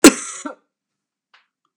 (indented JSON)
{
  "cough_length": "1.8 s",
  "cough_amplitude": 32768,
  "cough_signal_mean_std_ratio": 0.2,
  "survey_phase": "beta (2021-08-13 to 2022-03-07)",
  "age": "65+",
  "gender": "Female",
  "wearing_mask": "No",
  "symptom_none": true,
  "smoker_status": "Prefer not to say",
  "respiratory_condition_asthma": false,
  "respiratory_condition_other": false,
  "recruitment_source": "REACT",
  "submission_delay": "1 day",
  "covid_test_result": "Negative",
  "covid_test_method": "RT-qPCR",
  "influenza_a_test_result": "Negative",
  "influenza_b_test_result": "Negative"
}